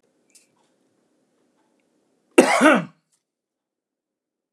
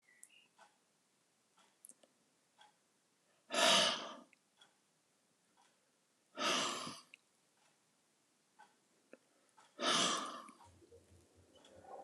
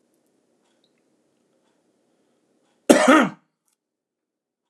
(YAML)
cough_length: 4.5 s
cough_amplitude: 32768
cough_signal_mean_std_ratio: 0.23
exhalation_length: 12.0 s
exhalation_amplitude: 4183
exhalation_signal_mean_std_ratio: 0.3
three_cough_length: 4.7 s
three_cough_amplitude: 32768
three_cough_signal_mean_std_ratio: 0.21
survey_phase: alpha (2021-03-01 to 2021-08-12)
age: 45-64
gender: Male
wearing_mask: 'No'
symptom_none: true
smoker_status: Never smoked
respiratory_condition_asthma: false
respiratory_condition_other: false
recruitment_source: REACT
submission_delay: 2 days
covid_test_result: Negative
covid_test_method: RT-qPCR
covid_ct_value: 41.0
covid_ct_gene: N gene